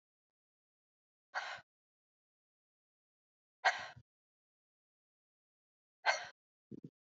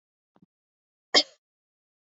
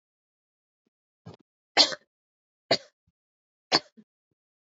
exhalation_length: 7.2 s
exhalation_amplitude: 5267
exhalation_signal_mean_std_ratio: 0.19
cough_length: 2.1 s
cough_amplitude: 19887
cough_signal_mean_std_ratio: 0.15
three_cough_length: 4.8 s
three_cough_amplitude: 24644
three_cough_signal_mean_std_ratio: 0.17
survey_phase: beta (2021-08-13 to 2022-03-07)
age: 18-44
gender: Female
wearing_mask: 'No'
symptom_cough_any: true
symptom_new_continuous_cough: true
symptom_runny_or_blocked_nose: true
symptom_shortness_of_breath: true
symptom_sore_throat: true
symptom_fatigue: true
symptom_fever_high_temperature: true
symptom_headache: true
symptom_other: true
symptom_onset: 3 days
smoker_status: Never smoked
respiratory_condition_asthma: false
respiratory_condition_other: false
recruitment_source: Test and Trace
submission_delay: 1 day
covid_test_result: Positive
covid_test_method: RT-qPCR
covid_ct_value: 22.8
covid_ct_gene: N gene
covid_ct_mean: 23.1
covid_viral_load: 26000 copies/ml
covid_viral_load_category: Low viral load (10K-1M copies/ml)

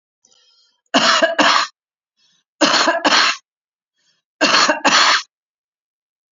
three_cough_length: 6.3 s
three_cough_amplitude: 32767
three_cough_signal_mean_std_ratio: 0.48
survey_phase: beta (2021-08-13 to 2022-03-07)
age: 45-64
gender: Female
wearing_mask: 'No'
symptom_none: true
smoker_status: Current smoker (e-cigarettes or vapes only)
respiratory_condition_asthma: false
respiratory_condition_other: false
recruitment_source: REACT
submission_delay: 4 days
covid_test_result: Negative
covid_test_method: RT-qPCR
influenza_a_test_result: Negative
influenza_b_test_result: Negative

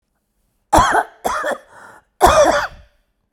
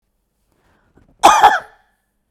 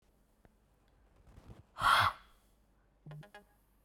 three_cough_length: 3.3 s
three_cough_amplitude: 32768
three_cough_signal_mean_std_ratio: 0.45
cough_length: 2.3 s
cough_amplitude: 32768
cough_signal_mean_std_ratio: 0.3
exhalation_length: 3.8 s
exhalation_amplitude: 6101
exhalation_signal_mean_std_ratio: 0.27
survey_phase: beta (2021-08-13 to 2022-03-07)
age: 45-64
gender: Female
wearing_mask: 'No'
symptom_cough_any: true
symptom_shortness_of_breath: true
symptom_onset: 12 days
smoker_status: Never smoked
respiratory_condition_asthma: true
respiratory_condition_other: false
recruitment_source: REACT
submission_delay: 1 day
covid_test_result: Negative
covid_test_method: RT-qPCR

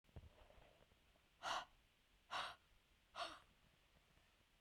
exhalation_length: 4.6 s
exhalation_amplitude: 869
exhalation_signal_mean_std_ratio: 0.39
survey_phase: beta (2021-08-13 to 2022-03-07)
age: 45-64
gender: Female
wearing_mask: 'No'
symptom_none: true
smoker_status: Never smoked
respiratory_condition_asthma: false
respiratory_condition_other: false
recruitment_source: REACT
submission_delay: 1 day
covid_test_result: Negative
covid_test_method: RT-qPCR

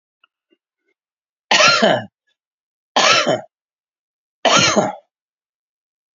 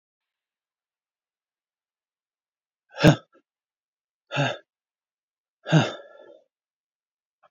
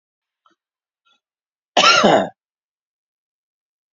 three_cough_length: 6.1 s
three_cough_amplitude: 32767
three_cough_signal_mean_std_ratio: 0.38
exhalation_length: 7.5 s
exhalation_amplitude: 24834
exhalation_signal_mean_std_ratio: 0.2
cough_length: 3.9 s
cough_amplitude: 32491
cough_signal_mean_std_ratio: 0.28
survey_phase: beta (2021-08-13 to 2022-03-07)
age: 65+
gender: Male
wearing_mask: 'No'
symptom_none: true
smoker_status: Never smoked
respiratory_condition_asthma: false
respiratory_condition_other: false
recruitment_source: REACT
submission_delay: 2 days
covid_test_result: Negative
covid_test_method: RT-qPCR
influenza_a_test_result: Negative
influenza_b_test_result: Negative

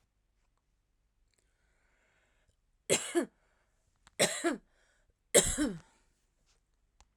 three_cough_length: 7.2 s
three_cough_amplitude: 17503
three_cough_signal_mean_std_ratio: 0.27
survey_phase: alpha (2021-03-01 to 2021-08-12)
age: 45-64
gender: Female
wearing_mask: 'No'
symptom_none: true
smoker_status: Ex-smoker
respiratory_condition_asthma: false
respiratory_condition_other: false
recruitment_source: REACT
submission_delay: 4 days
covid_test_method: RT-qPCR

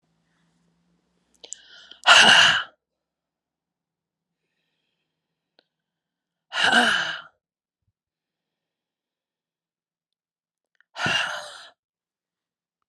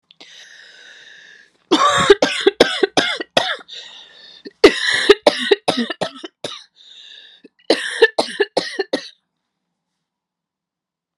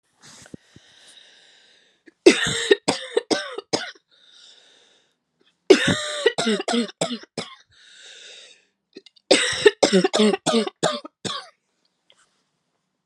exhalation_length: 12.9 s
exhalation_amplitude: 31052
exhalation_signal_mean_std_ratio: 0.25
cough_length: 11.2 s
cough_amplitude: 32768
cough_signal_mean_std_ratio: 0.37
three_cough_length: 13.1 s
three_cough_amplitude: 32690
three_cough_signal_mean_std_ratio: 0.36
survey_phase: alpha (2021-03-01 to 2021-08-12)
age: 45-64
gender: Female
wearing_mask: 'No'
symptom_cough_any: true
symptom_shortness_of_breath: true
symptom_fatigue: true
symptom_headache: true
symptom_onset: 7 days
smoker_status: Never smoked
respiratory_condition_asthma: false
respiratory_condition_other: false
recruitment_source: Test and Trace
submission_delay: 1 day
covid_test_result: Positive
covid_test_method: RT-qPCR
covid_ct_value: 32.3
covid_ct_gene: ORF1ab gene
covid_ct_mean: 33.3
covid_viral_load: 12 copies/ml
covid_viral_load_category: Minimal viral load (< 10K copies/ml)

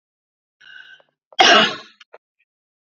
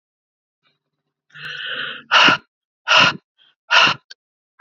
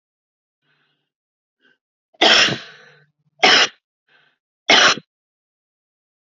cough_length: 2.8 s
cough_amplitude: 32768
cough_signal_mean_std_ratio: 0.29
exhalation_length: 4.6 s
exhalation_amplitude: 30493
exhalation_signal_mean_std_ratio: 0.37
three_cough_length: 6.3 s
three_cough_amplitude: 31822
three_cough_signal_mean_std_ratio: 0.3
survey_phase: beta (2021-08-13 to 2022-03-07)
age: 45-64
gender: Female
wearing_mask: 'No'
symptom_runny_or_blocked_nose: true
smoker_status: Ex-smoker
respiratory_condition_asthma: false
respiratory_condition_other: false
recruitment_source: Test and Trace
submission_delay: 2 days
covid_test_result: Positive
covid_test_method: RT-qPCR
covid_ct_value: 26.7
covid_ct_gene: ORF1ab gene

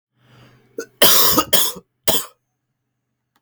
three_cough_length: 3.4 s
three_cough_amplitude: 32768
three_cough_signal_mean_std_ratio: 0.39
survey_phase: beta (2021-08-13 to 2022-03-07)
age: 18-44
gender: Male
wearing_mask: 'No'
symptom_cough_any: true
symptom_new_continuous_cough: true
symptom_runny_or_blocked_nose: true
symptom_shortness_of_breath: true
symptom_sore_throat: true
symptom_fever_high_temperature: true
symptom_headache: true
symptom_change_to_sense_of_smell_or_taste: true
symptom_loss_of_taste: true
symptom_other: true
symptom_onset: 5 days
smoker_status: Current smoker (1 to 10 cigarettes per day)
respiratory_condition_asthma: false
respiratory_condition_other: false
recruitment_source: Test and Trace
submission_delay: 1 day
covid_test_result: Positive
covid_test_method: RT-qPCR
covid_ct_value: 36.1
covid_ct_gene: ORF1ab gene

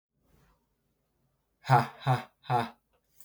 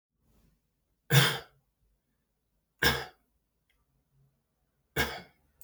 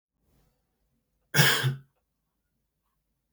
exhalation_length: 3.2 s
exhalation_amplitude: 13398
exhalation_signal_mean_std_ratio: 0.3
three_cough_length: 5.6 s
three_cough_amplitude: 11891
three_cough_signal_mean_std_ratio: 0.25
cough_length: 3.3 s
cough_amplitude: 17225
cough_signal_mean_std_ratio: 0.27
survey_phase: beta (2021-08-13 to 2022-03-07)
age: 18-44
gender: Male
wearing_mask: 'No'
symptom_runny_or_blocked_nose: true
symptom_onset: 4 days
smoker_status: Never smoked
respiratory_condition_asthma: false
respiratory_condition_other: false
recruitment_source: Test and Trace
submission_delay: 2 days
covid_test_result: Positive
covid_test_method: RT-qPCR
covid_ct_value: 25.7
covid_ct_gene: N gene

